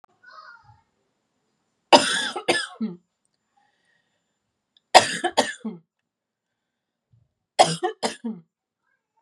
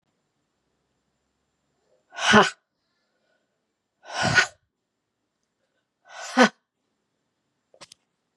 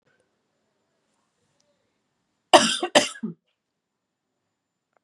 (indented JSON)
{
  "three_cough_length": "9.2 s",
  "three_cough_amplitude": 32768,
  "three_cough_signal_mean_std_ratio": 0.25,
  "exhalation_length": "8.4 s",
  "exhalation_amplitude": 32315,
  "exhalation_signal_mean_std_ratio": 0.22,
  "cough_length": "5.0 s",
  "cough_amplitude": 32754,
  "cough_signal_mean_std_ratio": 0.19,
  "survey_phase": "beta (2021-08-13 to 2022-03-07)",
  "age": "18-44",
  "gender": "Female",
  "wearing_mask": "No",
  "symptom_cough_any": true,
  "symptom_runny_or_blocked_nose": true,
  "smoker_status": "Never smoked",
  "respiratory_condition_asthma": true,
  "respiratory_condition_other": false,
  "recruitment_source": "Test and Trace",
  "submission_delay": "2 days",
  "covid_test_result": "Positive",
  "covid_test_method": "ePCR"
}